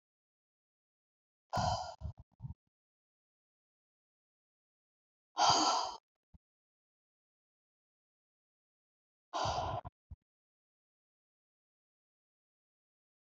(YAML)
exhalation_length: 13.4 s
exhalation_amplitude: 5091
exhalation_signal_mean_std_ratio: 0.25
survey_phase: beta (2021-08-13 to 2022-03-07)
age: 65+
gender: Female
wearing_mask: 'No'
symptom_none: true
smoker_status: Never smoked
respiratory_condition_asthma: true
respiratory_condition_other: false
recruitment_source: REACT
submission_delay: 9 days
covid_test_result: Negative
covid_test_method: RT-qPCR
influenza_a_test_result: Negative
influenza_b_test_result: Negative